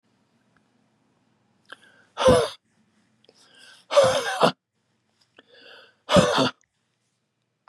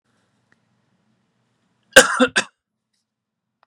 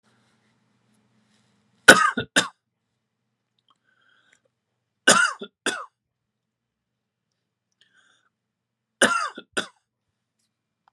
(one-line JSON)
{"exhalation_length": "7.7 s", "exhalation_amplitude": 28175, "exhalation_signal_mean_std_ratio": 0.31, "cough_length": "3.7 s", "cough_amplitude": 32768, "cough_signal_mean_std_ratio": 0.2, "three_cough_length": "10.9 s", "three_cough_amplitude": 32768, "three_cough_signal_mean_std_ratio": 0.2, "survey_phase": "beta (2021-08-13 to 2022-03-07)", "age": "65+", "gender": "Male", "wearing_mask": "No", "symptom_sore_throat": true, "smoker_status": "Never smoked", "respiratory_condition_asthma": false, "respiratory_condition_other": false, "recruitment_source": "Test and Trace", "submission_delay": "2 days", "covid_test_result": "Positive", "covid_test_method": "RT-qPCR", "covid_ct_value": 21.1, "covid_ct_gene": "ORF1ab gene", "covid_ct_mean": 21.6, "covid_viral_load": "84000 copies/ml", "covid_viral_load_category": "Low viral load (10K-1M copies/ml)"}